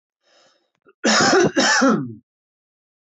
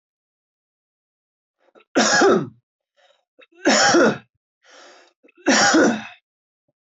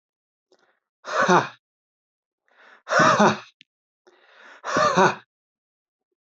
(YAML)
cough_length: 3.2 s
cough_amplitude: 20192
cough_signal_mean_std_ratio: 0.49
three_cough_length: 6.8 s
three_cough_amplitude: 20640
three_cough_signal_mean_std_ratio: 0.41
exhalation_length: 6.2 s
exhalation_amplitude: 21920
exhalation_signal_mean_std_ratio: 0.35
survey_phase: alpha (2021-03-01 to 2021-08-12)
age: 18-44
gender: Male
wearing_mask: 'No'
symptom_none: true
smoker_status: Never smoked
respiratory_condition_asthma: false
respiratory_condition_other: false
recruitment_source: Test and Trace
submission_delay: -1 day
covid_test_result: Negative
covid_test_method: LFT